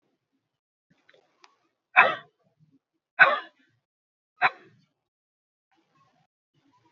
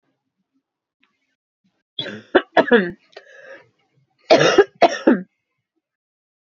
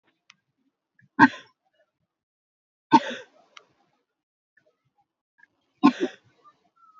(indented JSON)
{
  "exhalation_length": "6.9 s",
  "exhalation_amplitude": 27014,
  "exhalation_signal_mean_std_ratio": 0.18,
  "cough_length": "6.5 s",
  "cough_amplitude": 32767,
  "cough_signal_mean_std_ratio": 0.3,
  "three_cough_length": "7.0 s",
  "three_cough_amplitude": 26410,
  "three_cough_signal_mean_std_ratio": 0.17,
  "survey_phase": "beta (2021-08-13 to 2022-03-07)",
  "age": "45-64",
  "gender": "Female",
  "wearing_mask": "No",
  "symptom_new_continuous_cough": true,
  "symptom_runny_or_blocked_nose": true,
  "symptom_headache": true,
  "symptom_onset": "2 days",
  "smoker_status": "Never smoked",
  "respiratory_condition_asthma": false,
  "respiratory_condition_other": false,
  "recruitment_source": "Test and Trace",
  "submission_delay": "1 day",
  "covid_test_result": "Positive",
  "covid_test_method": "RT-qPCR",
  "covid_ct_value": 23.3,
  "covid_ct_gene": "N gene"
}